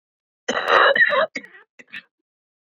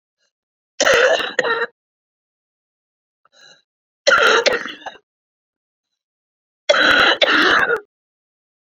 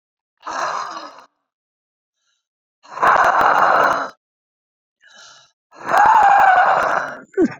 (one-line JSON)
{"cough_length": "2.6 s", "cough_amplitude": 26898, "cough_signal_mean_std_ratio": 0.44, "three_cough_length": "8.8 s", "three_cough_amplitude": 32743, "three_cough_signal_mean_std_ratio": 0.42, "exhalation_length": "7.6 s", "exhalation_amplitude": 28413, "exhalation_signal_mean_std_ratio": 0.52, "survey_phase": "beta (2021-08-13 to 2022-03-07)", "age": "45-64", "gender": "Female", "wearing_mask": "No", "symptom_cough_any": true, "symptom_runny_or_blocked_nose": true, "symptom_shortness_of_breath": true, "symptom_onset": "12 days", "smoker_status": "Current smoker (11 or more cigarettes per day)", "respiratory_condition_asthma": false, "respiratory_condition_other": true, "recruitment_source": "REACT", "submission_delay": "6 days", "covid_test_result": "Negative", "covid_test_method": "RT-qPCR", "influenza_a_test_result": "Negative", "influenza_b_test_result": "Negative"}